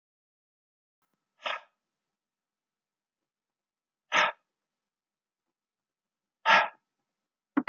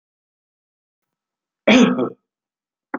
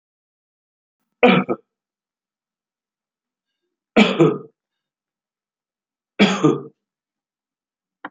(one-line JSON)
{"exhalation_length": "7.7 s", "exhalation_amplitude": 16239, "exhalation_signal_mean_std_ratio": 0.2, "cough_length": "3.0 s", "cough_amplitude": 27763, "cough_signal_mean_std_ratio": 0.29, "three_cough_length": "8.1 s", "three_cough_amplitude": 27876, "three_cough_signal_mean_std_ratio": 0.26, "survey_phase": "beta (2021-08-13 to 2022-03-07)", "age": "65+", "gender": "Male", "wearing_mask": "No", "symptom_cough_any": true, "symptom_runny_or_blocked_nose": true, "symptom_headache": true, "symptom_onset": "5 days", "smoker_status": "Ex-smoker", "respiratory_condition_asthma": false, "respiratory_condition_other": false, "recruitment_source": "Test and Trace", "submission_delay": "2 days", "covid_test_result": "Positive", "covid_test_method": "RT-qPCR", "covid_ct_value": 18.0, "covid_ct_gene": "N gene", "covid_ct_mean": 18.1, "covid_viral_load": "1100000 copies/ml", "covid_viral_load_category": "High viral load (>1M copies/ml)"}